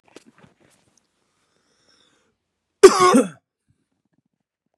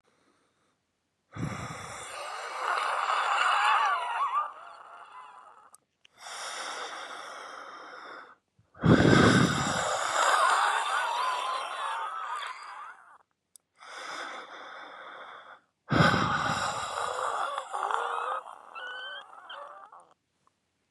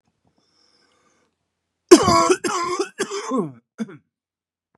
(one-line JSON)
{"cough_length": "4.8 s", "cough_amplitude": 32768, "cough_signal_mean_std_ratio": 0.21, "exhalation_length": "20.9 s", "exhalation_amplitude": 15888, "exhalation_signal_mean_std_ratio": 0.57, "three_cough_length": "4.8 s", "three_cough_amplitude": 32768, "three_cough_signal_mean_std_ratio": 0.33, "survey_phase": "beta (2021-08-13 to 2022-03-07)", "age": "45-64", "gender": "Male", "wearing_mask": "No", "symptom_cough_any": true, "symptom_runny_or_blocked_nose": true, "symptom_sore_throat": true, "symptom_fever_high_temperature": true, "symptom_headache": true, "symptom_other": true, "symptom_onset": "3 days", "smoker_status": "Never smoked", "respiratory_condition_asthma": false, "respiratory_condition_other": false, "recruitment_source": "Test and Trace", "submission_delay": "1 day", "covid_test_result": "Positive", "covid_test_method": "RT-qPCR", "covid_ct_value": 17.8, "covid_ct_gene": "ORF1ab gene", "covid_ct_mean": 18.1, "covid_viral_load": "1200000 copies/ml", "covid_viral_load_category": "High viral load (>1M copies/ml)"}